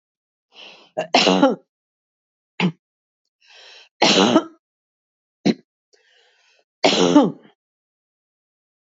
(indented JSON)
{
  "three_cough_length": "8.9 s",
  "three_cough_amplitude": 31415,
  "three_cough_signal_mean_std_ratio": 0.33,
  "survey_phase": "beta (2021-08-13 to 2022-03-07)",
  "age": "65+",
  "gender": "Female",
  "wearing_mask": "No",
  "symptom_none": true,
  "symptom_onset": "5 days",
  "smoker_status": "Ex-smoker",
  "respiratory_condition_asthma": false,
  "respiratory_condition_other": false,
  "recruitment_source": "Test and Trace",
  "submission_delay": "1 day",
  "covid_test_result": "Positive",
  "covid_test_method": "RT-qPCR",
  "covid_ct_value": 23.6,
  "covid_ct_gene": "N gene",
  "covid_ct_mean": 23.7,
  "covid_viral_load": "17000 copies/ml",
  "covid_viral_load_category": "Low viral load (10K-1M copies/ml)"
}